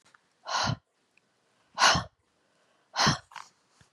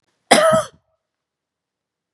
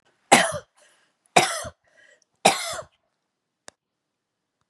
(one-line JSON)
{"exhalation_length": "3.9 s", "exhalation_amplitude": 12304, "exhalation_signal_mean_std_ratio": 0.33, "cough_length": "2.1 s", "cough_amplitude": 32768, "cough_signal_mean_std_ratio": 0.31, "three_cough_length": "4.7 s", "three_cough_amplitude": 32768, "three_cough_signal_mean_std_ratio": 0.26, "survey_phase": "beta (2021-08-13 to 2022-03-07)", "age": "65+", "gender": "Female", "wearing_mask": "No", "symptom_none": true, "smoker_status": "Never smoked", "respiratory_condition_asthma": false, "respiratory_condition_other": false, "recruitment_source": "REACT", "submission_delay": "2 days", "covid_test_result": "Negative", "covid_test_method": "RT-qPCR", "influenza_a_test_result": "Negative", "influenza_b_test_result": "Negative"}